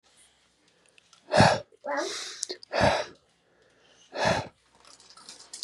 {"exhalation_length": "5.6 s", "exhalation_amplitude": 18873, "exhalation_signal_mean_std_ratio": 0.37, "survey_phase": "beta (2021-08-13 to 2022-03-07)", "age": "18-44", "gender": "Male", "wearing_mask": "No", "symptom_cough_any": true, "symptom_new_continuous_cough": true, "symptom_runny_or_blocked_nose": true, "symptom_sore_throat": true, "symptom_headache": true, "symptom_onset": "4 days", "smoker_status": "Never smoked", "respiratory_condition_asthma": false, "respiratory_condition_other": false, "recruitment_source": "Test and Trace", "submission_delay": "1 day", "covid_test_method": "RT-qPCR", "covid_ct_value": 30.2, "covid_ct_gene": "ORF1ab gene", "covid_ct_mean": 30.7, "covid_viral_load": "85 copies/ml", "covid_viral_load_category": "Minimal viral load (< 10K copies/ml)"}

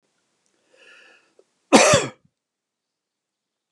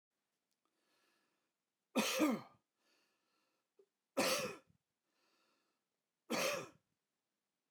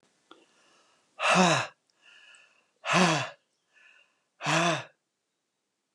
{"cough_length": "3.7 s", "cough_amplitude": 32768, "cough_signal_mean_std_ratio": 0.23, "three_cough_length": "7.7 s", "three_cough_amplitude": 2599, "three_cough_signal_mean_std_ratio": 0.31, "exhalation_length": "5.9 s", "exhalation_amplitude": 11582, "exhalation_signal_mean_std_ratio": 0.37, "survey_phase": "beta (2021-08-13 to 2022-03-07)", "age": "65+", "gender": "Male", "wearing_mask": "No", "symptom_none": true, "smoker_status": "Never smoked", "respiratory_condition_asthma": false, "respiratory_condition_other": false, "recruitment_source": "REACT", "submission_delay": "4 days", "covid_test_result": "Negative", "covid_test_method": "RT-qPCR"}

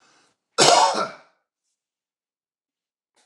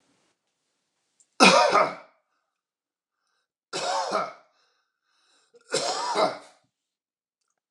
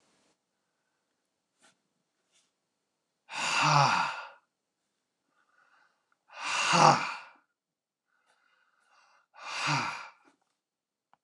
{"cough_length": "3.3 s", "cough_amplitude": 29203, "cough_signal_mean_std_ratio": 0.3, "three_cough_length": "7.7 s", "three_cough_amplitude": 27615, "three_cough_signal_mean_std_ratio": 0.32, "exhalation_length": "11.2 s", "exhalation_amplitude": 19528, "exhalation_signal_mean_std_ratio": 0.31, "survey_phase": "beta (2021-08-13 to 2022-03-07)", "age": "65+", "gender": "Male", "wearing_mask": "No", "symptom_none": true, "smoker_status": "Never smoked", "respiratory_condition_asthma": false, "respiratory_condition_other": false, "recruitment_source": "REACT", "submission_delay": "1 day", "covid_test_result": "Negative", "covid_test_method": "RT-qPCR", "influenza_a_test_result": "Negative", "influenza_b_test_result": "Negative"}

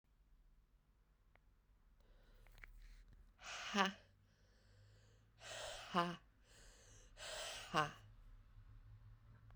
{"exhalation_length": "9.6 s", "exhalation_amplitude": 3322, "exhalation_signal_mean_std_ratio": 0.37, "survey_phase": "beta (2021-08-13 to 2022-03-07)", "age": "45-64", "gender": "Female", "wearing_mask": "No", "symptom_cough_any": true, "symptom_runny_or_blocked_nose": true, "symptom_shortness_of_breath": true, "symptom_sore_throat": true, "symptom_fatigue": true, "symptom_fever_high_temperature": true, "symptom_headache": true, "smoker_status": "Never smoked", "respiratory_condition_asthma": false, "respiratory_condition_other": false, "recruitment_source": "Test and Trace", "submission_delay": "2 days", "covid_test_result": "Positive", "covid_test_method": "RT-qPCR", "covid_ct_value": 15.7, "covid_ct_gene": "ORF1ab gene", "covid_ct_mean": 16.0, "covid_viral_load": "5500000 copies/ml", "covid_viral_load_category": "High viral load (>1M copies/ml)"}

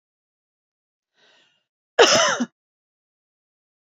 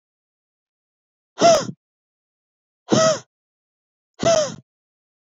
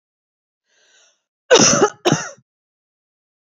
{"three_cough_length": "3.9 s", "three_cough_amplitude": 32767, "three_cough_signal_mean_std_ratio": 0.25, "exhalation_length": "5.4 s", "exhalation_amplitude": 24673, "exhalation_signal_mean_std_ratio": 0.31, "cough_length": "3.4 s", "cough_amplitude": 30332, "cough_signal_mean_std_ratio": 0.31, "survey_phase": "beta (2021-08-13 to 2022-03-07)", "age": "18-44", "gender": "Female", "wearing_mask": "No", "symptom_runny_or_blocked_nose": true, "symptom_headache": true, "smoker_status": "Ex-smoker", "respiratory_condition_asthma": false, "respiratory_condition_other": false, "recruitment_source": "Test and Trace", "submission_delay": "2 days", "covid_test_result": "Positive", "covid_test_method": "RT-qPCR"}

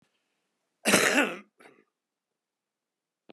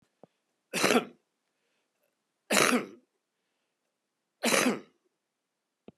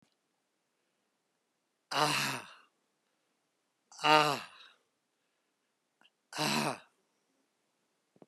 {"cough_length": "3.3 s", "cough_amplitude": 18323, "cough_signal_mean_std_ratio": 0.28, "three_cough_length": "6.0 s", "three_cough_amplitude": 18860, "three_cough_signal_mean_std_ratio": 0.31, "exhalation_length": "8.3 s", "exhalation_amplitude": 12770, "exhalation_signal_mean_std_ratio": 0.27, "survey_phase": "beta (2021-08-13 to 2022-03-07)", "age": "65+", "gender": "Male", "wearing_mask": "No", "symptom_none": true, "smoker_status": "Never smoked", "respiratory_condition_asthma": true, "respiratory_condition_other": false, "recruitment_source": "REACT", "submission_delay": "11 days", "covid_test_result": "Negative", "covid_test_method": "RT-qPCR", "influenza_a_test_result": "Negative", "influenza_b_test_result": "Negative"}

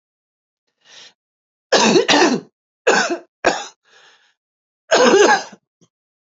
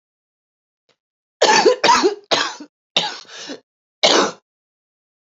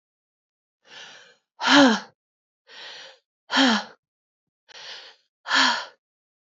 {"three_cough_length": "6.2 s", "three_cough_amplitude": 32768, "three_cough_signal_mean_std_ratio": 0.42, "cough_length": "5.4 s", "cough_amplitude": 31583, "cough_signal_mean_std_ratio": 0.4, "exhalation_length": "6.5 s", "exhalation_amplitude": 24421, "exhalation_signal_mean_std_ratio": 0.32, "survey_phase": "beta (2021-08-13 to 2022-03-07)", "age": "45-64", "gender": "Female", "wearing_mask": "No", "symptom_cough_any": true, "symptom_runny_or_blocked_nose": true, "symptom_fatigue": true, "symptom_fever_high_temperature": true, "symptom_onset": "3 days", "smoker_status": "Never smoked", "respiratory_condition_asthma": false, "respiratory_condition_other": false, "recruitment_source": "Test and Trace", "submission_delay": "2 days", "covid_test_result": "Positive", "covid_test_method": "ePCR"}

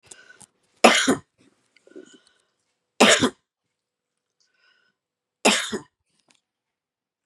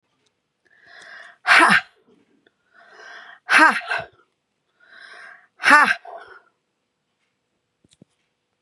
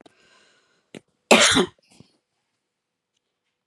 {"three_cough_length": "7.3 s", "three_cough_amplitude": 31904, "three_cough_signal_mean_std_ratio": 0.25, "exhalation_length": "8.6 s", "exhalation_amplitude": 32767, "exhalation_signal_mean_std_ratio": 0.28, "cough_length": "3.7 s", "cough_amplitude": 31724, "cough_signal_mean_std_ratio": 0.24, "survey_phase": "beta (2021-08-13 to 2022-03-07)", "age": "65+", "gender": "Female", "wearing_mask": "No", "symptom_none": true, "smoker_status": "Ex-smoker", "respiratory_condition_asthma": false, "respiratory_condition_other": false, "recruitment_source": "REACT", "submission_delay": "0 days", "covid_test_result": "Negative", "covid_test_method": "RT-qPCR", "influenza_a_test_result": "Negative", "influenza_b_test_result": "Negative"}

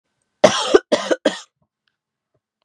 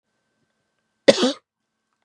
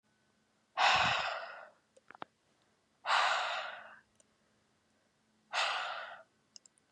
{"three_cough_length": "2.6 s", "three_cough_amplitude": 32768, "three_cough_signal_mean_std_ratio": 0.31, "cough_length": "2.0 s", "cough_amplitude": 32767, "cough_signal_mean_std_ratio": 0.21, "exhalation_length": "6.9 s", "exhalation_amplitude": 5737, "exhalation_signal_mean_std_ratio": 0.42, "survey_phase": "beta (2021-08-13 to 2022-03-07)", "age": "18-44", "gender": "Female", "wearing_mask": "No", "symptom_none": true, "smoker_status": "Never smoked", "respiratory_condition_asthma": false, "respiratory_condition_other": false, "recruitment_source": "REACT", "submission_delay": "2 days", "covid_test_result": "Negative", "covid_test_method": "RT-qPCR", "influenza_a_test_result": "Negative", "influenza_b_test_result": "Negative"}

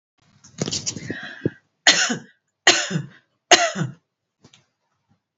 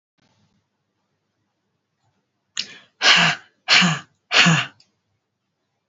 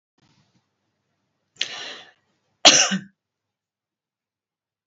{"three_cough_length": "5.4 s", "three_cough_amplitude": 32767, "three_cough_signal_mean_std_ratio": 0.34, "exhalation_length": "5.9 s", "exhalation_amplitude": 28913, "exhalation_signal_mean_std_ratio": 0.33, "cough_length": "4.9 s", "cough_amplitude": 32745, "cough_signal_mean_std_ratio": 0.2, "survey_phase": "alpha (2021-03-01 to 2021-08-12)", "age": "45-64", "gender": "Female", "wearing_mask": "No", "symptom_shortness_of_breath": true, "symptom_headache": true, "smoker_status": "Never smoked", "respiratory_condition_asthma": false, "respiratory_condition_other": false, "recruitment_source": "REACT", "submission_delay": "2 days", "covid_test_result": "Negative", "covid_test_method": "RT-qPCR"}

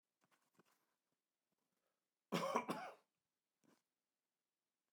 {"cough_length": "4.9 s", "cough_amplitude": 2185, "cough_signal_mean_std_ratio": 0.25, "survey_phase": "alpha (2021-03-01 to 2021-08-12)", "age": "65+", "gender": "Male", "wearing_mask": "No", "symptom_none": true, "smoker_status": "Ex-smoker", "respiratory_condition_asthma": false, "respiratory_condition_other": false, "recruitment_source": "REACT", "submission_delay": "2 days", "covid_test_result": "Negative", "covid_test_method": "RT-qPCR"}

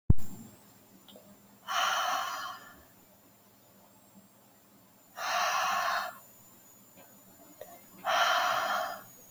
{"exhalation_length": "9.3 s", "exhalation_amplitude": 14092, "exhalation_signal_mean_std_ratio": 0.47, "survey_phase": "alpha (2021-03-01 to 2021-08-12)", "age": "18-44", "gender": "Female", "wearing_mask": "No", "symptom_cough_any": true, "symptom_fever_high_temperature": true, "symptom_onset": "3 days", "smoker_status": "Never smoked", "respiratory_condition_asthma": false, "respiratory_condition_other": false, "recruitment_source": "Test and Trace", "submission_delay": "2 days", "covid_test_result": "Positive", "covid_test_method": "RT-qPCR", "covid_ct_value": 23.9, "covid_ct_gene": "ORF1ab gene"}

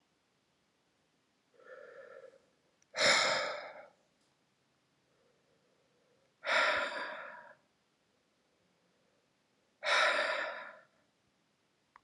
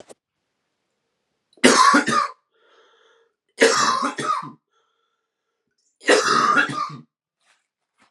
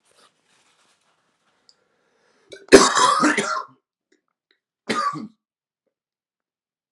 {"exhalation_length": "12.0 s", "exhalation_amplitude": 5764, "exhalation_signal_mean_std_ratio": 0.35, "three_cough_length": "8.1 s", "three_cough_amplitude": 32768, "three_cough_signal_mean_std_ratio": 0.41, "cough_length": "6.9 s", "cough_amplitude": 32768, "cough_signal_mean_std_ratio": 0.27, "survey_phase": "alpha (2021-03-01 to 2021-08-12)", "age": "18-44", "gender": "Male", "wearing_mask": "No", "symptom_cough_any": true, "symptom_fatigue": true, "symptom_fever_high_temperature": true, "symptom_headache": true, "symptom_change_to_sense_of_smell_or_taste": true, "symptom_onset": "5 days", "smoker_status": "Never smoked", "respiratory_condition_asthma": true, "respiratory_condition_other": false, "recruitment_source": "Test and Trace", "submission_delay": "2 days", "covid_test_result": "Positive", "covid_test_method": "RT-qPCR", "covid_ct_value": 13.8, "covid_ct_gene": "ORF1ab gene", "covid_ct_mean": 14.1, "covid_viral_load": "24000000 copies/ml", "covid_viral_load_category": "High viral load (>1M copies/ml)"}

